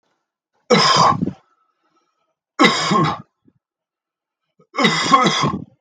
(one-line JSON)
{"three_cough_length": "5.8 s", "three_cough_amplitude": 32691, "three_cough_signal_mean_std_ratio": 0.47, "survey_phase": "beta (2021-08-13 to 2022-03-07)", "age": "45-64", "gender": "Male", "wearing_mask": "No", "symptom_cough_any": true, "symptom_runny_or_blocked_nose": true, "symptom_sore_throat": true, "symptom_abdominal_pain": true, "symptom_diarrhoea": true, "symptom_fever_high_temperature": true, "symptom_headache": true, "symptom_change_to_sense_of_smell_or_taste": true, "symptom_onset": "3 days", "smoker_status": "Never smoked", "respiratory_condition_asthma": false, "respiratory_condition_other": false, "recruitment_source": "Test and Trace", "submission_delay": "1 day", "covid_test_result": "Positive", "covid_test_method": "RT-qPCR"}